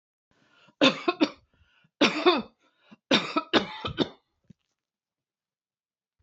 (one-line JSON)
{"three_cough_length": "6.2 s", "three_cough_amplitude": 18666, "three_cough_signal_mean_std_ratio": 0.32, "survey_phase": "beta (2021-08-13 to 2022-03-07)", "age": "65+", "gender": "Female", "wearing_mask": "No", "symptom_none": true, "smoker_status": "Never smoked", "respiratory_condition_asthma": false, "respiratory_condition_other": false, "recruitment_source": "Test and Trace", "submission_delay": "2 days", "covid_test_result": "Positive", "covid_test_method": "RT-qPCR", "covid_ct_value": 33.1, "covid_ct_gene": "ORF1ab gene"}